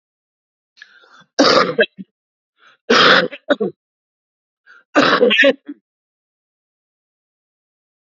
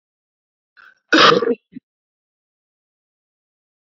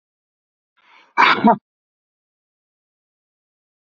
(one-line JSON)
{"three_cough_length": "8.1 s", "three_cough_amplitude": 32768, "three_cough_signal_mean_std_ratio": 0.35, "cough_length": "3.9 s", "cough_amplitude": 29744, "cough_signal_mean_std_ratio": 0.25, "exhalation_length": "3.8 s", "exhalation_amplitude": 27996, "exhalation_signal_mean_std_ratio": 0.23, "survey_phase": "beta (2021-08-13 to 2022-03-07)", "age": "65+", "gender": "Male", "wearing_mask": "No", "symptom_cough_any": true, "symptom_sore_throat": true, "symptom_onset": "4 days", "smoker_status": "Ex-smoker", "respiratory_condition_asthma": false, "respiratory_condition_other": false, "recruitment_source": "Test and Trace", "submission_delay": "1 day", "covid_test_result": "Positive", "covid_test_method": "RT-qPCR", "covid_ct_value": 17.3, "covid_ct_gene": "N gene"}